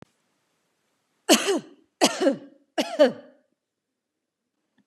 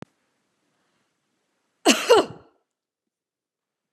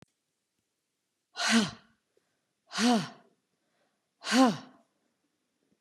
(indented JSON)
{
  "three_cough_length": "4.9 s",
  "three_cough_amplitude": 25519,
  "three_cough_signal_mean_std_ratio": 0.31,
  "cough_length": "3.9 s",
  "cough_amplitude": 28712,
  "cough_signal_mean_std_ratio": 0.22,
  "exhalation_length": "5.8 s",
  "exhalation_amplitude": 10681,
  "exhalation_signal_mean_std_ratio": 0.31,
  "survey_phase": "beta (2021-08-13 to 2022-03-07)",
  "age": "45-64",
  "gender": "Female",
  "wearing_mask": "No",
  "symptom_none": true,
  "smoker_status": "Never smoked",
  "respiratory_condition_asthma": false,
  "respiratory_condition_other": false,
  "recruitment_source": "REACT",
  "submission_delay": "1 day",
  "covid_test_result": "Negative",
  "covid_test_method": "RT-qPCR",
  "influenza_a_test_result": "Negative",
  "influenza_b_test_result": "Negative"
}